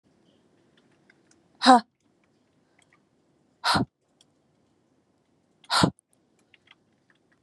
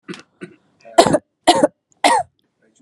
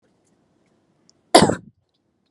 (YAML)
exhalation_length: 7.4 s
exhalation_amplitude: 29926
exhalation_signal_mean_std_ratio: 0.2
three_cough_length: 2.8 s
three_cough_amplitude: 32768
three_cough_signal_mean_std_ratio: 0.36
cough_length: 2.3 s
cough_amplitude: 32768
cough_signal_mean_std_ratio: 0.21
survey_phase: beta (2021-08-13 to 2022-03-07)
age: 18-44
gender: Female
wearing_mask: 'No'
symptom_none: true
smoker_status: Never smoked
respiratory_condition_asthma: false
respiratory_condition_other: false
recruitment_source: REACT
submission_delay: 1 day
covid_test_result: Negative
covid_test_method: RT-qPCR